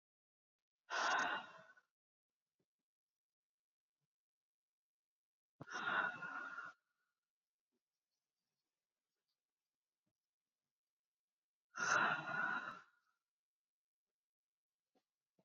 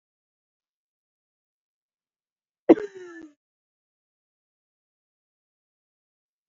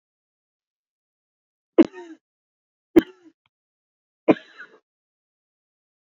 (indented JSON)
{
  "exhalation_length": "15.4 s",
  "exhalation_amplitude": 2134,
  "exhalation_signal_mean_std_ratio": 0.3,
  "cough_length": "6.5 s",
  "cough_amplitude": 26365,
  "cough_signal_mean_std_ratio": 0.09,
  "three_cough_length": "6.1 s",
  "three_cough_amplitude": 26287,
  "three_cough_signal_mean_std_ratio": 0.13,
  "survey_phase": "beta (2021-08-13 to 2022-03-07)",
  "age": "18-44",
  "gender": "Female",
  "wearing_mask": "No",
  "symptom_cough_any": true,
  "symptom_sore_throat": true,
  "symptom_fatigue": true,
  "symptom_fever_high_temperature": true,
  "smoker_status": "Ex-smoker",
  "respiratory_condition_asthma": true,
  "respiratory_condition_other": false,
  "recruitment_source": "Test and Trace",
  "submission_delay": "2 days",
  "covid_test_result": "Positive",
  "covid_test_method": "LFT"
}